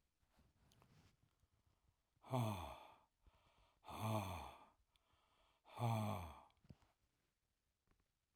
{"exhalation_length": "8.4 s", "exhalation_amplitude": 1150, "exhalation_signal_mean_std_ratio": 0.36, "survey_phase": "alpha (2021-03-01 to 2021-08-12)", "age": "65+", "gender": "Male", "wearing_mask": "No", "symptom_none": true, "smoker_status": "Never smoked", "respiratory_condition_asthma": false, "respiratory_condition_other": false, "recruitment_source": "REACT", "submission_delay": "3 days", "covid_test_result": "Negative", "covid_test_method": "RT-qPCR"}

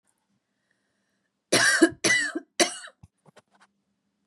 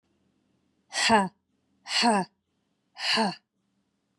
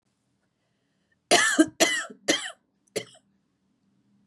{"three_cough_length": "4.3 s", "three_cough_amplitude": 20769, "three_cough_signal_mean_std_ratio": 0.34, "exhalation_length": "4.2 s", "exhalation_amplitude": 14376, "exhalation_signal_mean_std_ratio": 0.39, "cough_length": "4.3 s", "cough_amplitude": 19295, "cough_signal_mean_std_ratio": 0.32, "survey_phase": "beta (2021-08-13 to 2022-03-07)", "age": "18-44", "gender": "Female", "wearing_mask": "No", "symptom_cough_any": true, "symptom_runny_or_blocked_nose": true, "symptom_shortness_of_breath": true, "symptom_fatigue": true, "symptom_onset": "4 days", "smoker_status": "Ex-smoker", "respiratory_condition_asthma": false, "respiratory_condition_other": false, "recruitment_source": "Test and Trace", "submission_delay": "1 day", "covid_test_result": "Positive", "covid_test_method": "RT-qPCR", "covid_ct_value": 31.8, "covid_ct_gene": "ORF1ab gene", "covid_ct_mean": 32.2, "covid_viral_load": "28 copies/ml", "covid_viral_load_category": "Minimal viral load (< 10K copies/ml)"}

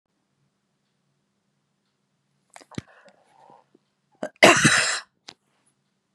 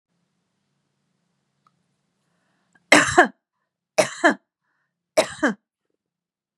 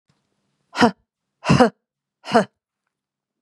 {"cough_length": "6.1 s", "cough_amplitude": 32767, "cough_signal_mean_std_ratio": 0.22, "three_cough_length": "6.6 s", "three_cough_amplitude": 32768, "three_cough_signal_mean_std_ratio": 0.24, "exhalation_length": "3.4 s", "exhalation_amplitude": 32046, "exhalation_signal_mean_std_ratio": 0.28, "survey_phase": "beta (2021-08-13 to 2022-03-07)", "age": "65+", "gender": "Female", "wearing_mask": "No", "symptom_none": true, "smoker_status": "Never smoked", "respiratory_condition_asthma": false, "respiratory_condition_other": false, "recruitment_source": "Test and Trace", "submission_delay": "2 days", "covid_test_result": "Positive", "covid_test_method": "RT-qPCR", "covid_ct_value": 21.9, "covid_ct_gene": "ORF1ab gene", "covid_ct_mean": 22.5, "covid_viral_load": "42000 copies/ml", "covid_viral_load_category": "Low viral load (10K-1M copies/ml)"}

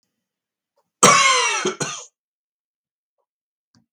{"cough_length": "3.9 s", "cough_amplitude": 32768, "cough_signal_mean_std_ratio": 0.34, "survey_phase": "beta (2021-08-13 to 2022-03-07)", "age": "45-64", "gender": "Male", "wearing_mask": "No", "symptom_none": true, "smoker_status": "Never smoked", "respiratory_condition_asthma": false, "respiratory_condition_other": false, "recruitment_source": "REACT", "submission_delay": "2 days", "covid_test_result": "Negative", "covid_test_method": "RT-qPCR"}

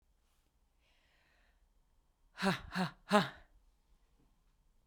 {"exhalation_length": "4.9 s", "exhalation_amplitude": 7293, "exhalation_signal_mean_std_ratio": 0.26, "survey_phase": "beta (2021-08-13 to 2022-03-07)", "age": "45-64", "gender": "Female", "wearing_mask": "No", "symptom_cough_any": true, "symptom_shortness_of_breath": true, "symptom_onset": "11 days", "smoker_status": "Ex-smoker", "respiratory_condition_asthma": false, "respiratory_condition_other": false, "recruitment_source": "REACT", "submission_delay": "0 days", "covid_test_result": "Negative", "covid_test_method": "RT-qPCR"}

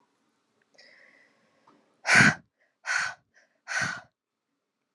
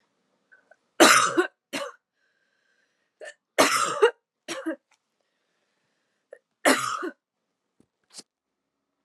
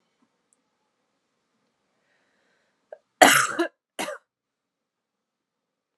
{"exhalation_length": "4.9 s", "exhalation_amplitude": 18038, "exhalation_signal_mean_std_ratio": 0.28, "three_cough_length": "9.0 s", "three_cough_amplitude": 31869, "three_cough_signal_mean_std_ratio": 0.29, "cough_length": "6.0 s", "cough_amplitude": 32132, "cough_signal_mean_std_ratio": 0.19, "survey_phase": "alpha (2021-03-01 to 2021-08-12)", "age": "18-44", "gender": "Female", "wearing_mask": "No", "symptom_cough_any": true, "symptom_new_continuous_cough": true, "symptom_abdominal_pain": true, "symptom_fatigue": true, "symptom_headache": true, "symptom_onset": "6 days", "smoker_status": "Never smoked", "respiratory_condition_asthma": false, "respiratory_condition_other": false, "recruitment_source": "Test and Trace", "submission_delay": "2 days", "covid_test_result": "Positive", "covid_test_method": "RT-qPCR", "covid_ct_value": 18.8, "covid_ct_gene": "N gene", "covid_ct_mean": 19.0, "covid_viral_load": "600000 copies/ml", "covid_viral_load_category": "Low viral load (10K-1M copies/ml)"}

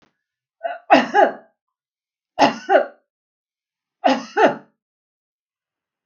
{"three_cough_length": "6.1 s", "three_cough_amplitude": 32768, "three_cough_signal_mean_std_ratio": 0.32, "survey_phase": "beta (2021-08-13 to 2022-03-07)", "age": "65+", "gender": "Female", "wearing_mask": "No", "symptom_none": true, "smoker_status": "Never smoked", "respiratory_condition_asthma": false, "respiratory_condition_other": false, "recruitment_source": "REACT", "submission_delay": "1 day", "covid_test_result": "Negative", "covid_test_method": "RT-qPCR", "influenza_a_test_result": "Negative", "influenza_b_test_result": "Negative"}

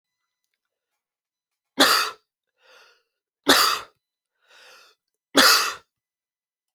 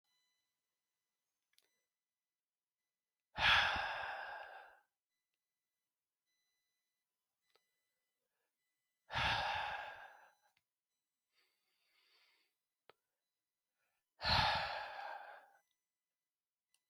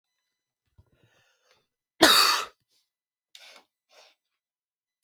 {"three_cough_length": "6.7 s", "three_cough_amplitude": 28726, "three_cough_signal_mean_std_ratio": 0.29, "exhalation_length": "16.9 s", "exhalation_amplitude": 3838, "exhalation_signal_mean_std_ratio": 0.29, "cough_length": "5.0 s", "cough_amplitude": 29303, "cough_signal_mean_std_ratio": 0.22, "survey_phase": "alpha (2021-03-01 to 2021-08-12)", "age": "18-44", "gender": "Male", "wearing_mask": "No", "symptom_none": true, "symptom_onset": "12 days", "smoker_status": "Never smoked", "respiratory_condition_asthma": false, "respiratory_condition_other": false, "recruitment_source": "REACT", "submission_delay": "4 days", "covid_test_result": "Negative", "covid_test_method": "RT-qPCR"}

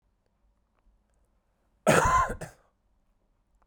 {"cough_length": "3.7 s", "cough_amplitude": 14746, "cough_signal_mean_std_ratio": 0.3, "survey_phase": "beta (2021-08-13 to 2022-03-07)", "age": "18-44", "gender": "Male", "wearing_mask": "No", "symptom_none": true, "smoker_status": "Never smoked", "respiratory_condition_asthma": false, "respiratory_condition_other": false, "recruitment_source": "REACT", "submission_delay": "10 days", "covid_test_result": "Negative", "covid_test_method": "RT-qPCR", "covid_ct_value": 46.0, "covid_ct_gene": "N gene"}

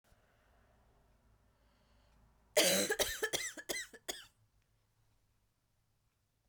{"cough_length": "6.5 s", "cough_amplitude": 5965, "cough_signal_mean_std_ratio": 0.31, "survey_phase": "beta (2021-08-13 to 2022-03-07)", "age": "18-44", "gender": "Female", "wearing_mask": "No", "symptom_cough_any": true, "symptom_runny_or_blocked_nose": true, "symptom_shortness_of_breath": true, "symptom_sore_throat": true, "symptom_fatigue": true, "symptom_fever_high_temperature": true, "symptom_headache": true, "symptom_change_to_sense_of_smell_or_taste": true, "symptom_other": true, "symptom_onset": "4 days", "smoker_status": "Never smoked", "respiratory_condition_asthma": false, "respiratory_condition_other": false, "recruitment_source": "Test and Trace", "submission_delay": "2 days", "covid_test_result": "Positive", "covid_test_method": "RT-qPCR"}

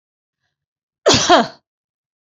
{"cough_length": "2.4 s", "cough_amplitude": 29537, "cough_signal_mean_std_ratio": 0.32, "survey_phase": "beta (2021-08-13 to 2022-03-07)", "age": "45-64", "gender": "Female", "wearing_mask": "No", "symptom_none": true, "smoker_status": "Never smoked", "respiratory_condition_asthma": false, "respiratory_condition_other": false, "recruitment_source": "REACT", "submission_delay": "1 day", "covid_test_result": "Negative", "covid_test_method": "RT-qPCR"}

